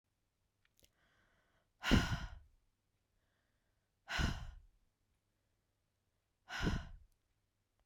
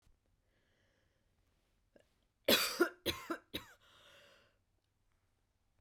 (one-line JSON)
{"exhalation_length": "7.9 s", "exhalation_amplitude": 4908, "exhalation_signal_mean_std_ratio": 0.28, "cough_length": "5.8 s", "cough_amplitude": 5229, "cough_signal_mean_std_ratio": 0.24, "survey_phase": "beta (2021-08-13 to 2022-03-07)", "age": "45-64", "gender": "Female", "wearing_mask": "No", "symptom_none": true, "smoker_status": "Ex-smoker", "respiratory_condition_asthma": false, "respiratory_condition_other": false, "recruitment_source": "REACT", "submission_delay": "2 days", "covid_test_result": "Negative", "covid_test_method": "RT-qPCR", "influenza_a_test_result": "Negative", "influenza_b_test_result": "Negative"}